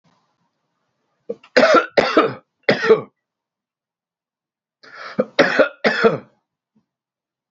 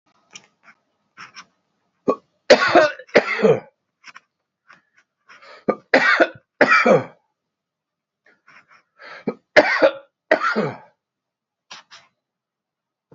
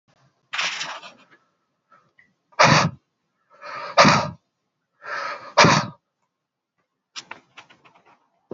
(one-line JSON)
{"cough_length": "7.5 s", "cough_amplitude": 32767, "cough_signal_mean_std_ratio": 0.35, "three_cough_length": "13.1 s", "three_cough_amplitude": 31930, "three_cough_signal_mean_std_ratio": 0.32, "exhalation_length": "8.5 s", "exhalation_amplitude": 30955, "exhalation_signal_mean_std_ratio": 0.31, "survey_phase": "beta (2021-08-13 to 2022-03-07)", "age": "45-64", "gender": "Male", "wearing_mask": "No", "symptom_none": true, "smoker_status": "Ex-smoker", "respiratory_condition_asthma": false, "respiratory_condition_other": false, "recruitment_source": "REACT", "submission_delay": "2 days", "covid_test_result": "Negative", "covid_test_method": "RT-qPCR", "influenza_a_test_result": "Negative", "influenza_b_test_result": "Negative"}